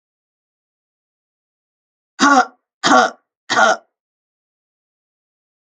three_cough_length: 5.7 s
three_cough_amplitude: 32767
three_cough_signal_mean_std_ratio: 0.29
survey_phase: alpha (2021-03-01 to 2021-08-12)
age: 45-64
gender: Female
wearing_mask: 'No'
symptom_none: true
smoker_status: Ex-smoker
respiratory_condition_asthma: false
respiratory_condition_other: false
recruitment_source: REACT
submission_delay: 21 days
covid_test_result: Negative
covid_test_method: RT-qPCR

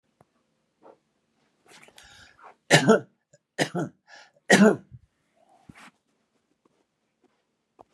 three_cough_length: 7.9 s
three_cough_amplitude: 28616
three_cough_signal_mean_std_ratio: 0.23
survey_phase: beta (2021-08-13 to 2022-03-07)
age: 65+
gender: Male
wearing_mask: 'No'
symptom_none: true
smoker_status: Never smoked
respiratory_condition_asthma: false
respiratory_condition_other: false
recruitment_source: REACT
submission_delay: 1 day
covid_test_result: Negative
covid_test_method: RT-qPCR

